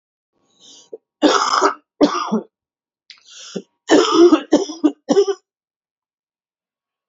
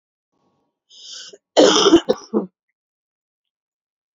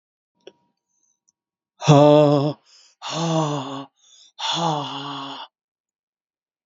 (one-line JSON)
{"three_cough_length": "7.1 s", "three_cough_amplitude": 28083, "three_cough_signal_mean_std_ratio": 0.4, "cough_length": "4.2 s", "cough_amplitude": 31511, "cough_signal_mean_std_ratio": 0.3, "exhalation_length": "6.7 s", "exhalation_amplitude": 28811, "exhalation_signal_mean_std_ratio": 0.38, "survey_phase": "beta (2021-08-13 to 2022-03-07)", "age": "45-64", "gender": "Female", "wearing_mask": "No", "symptom_cough_any": true, "symptom_runny_or_blocked_nose": true, "symptom_sore_throat": true, "symptom_fever_high_temperature": true, "symptom_headache": true, "symptom_change_to_sense_of_smell_or_taste": true, "symptom_onset": "9 days", "smoker_status": "Never smoked", "respiratory_condition_asthma": false, "respiratory_condition_other": false, "recruitment_source": "Test and Trace", "submission_delay": "1 day", "covid_test_result": "Positive", "covid_test_method": "LAMP"}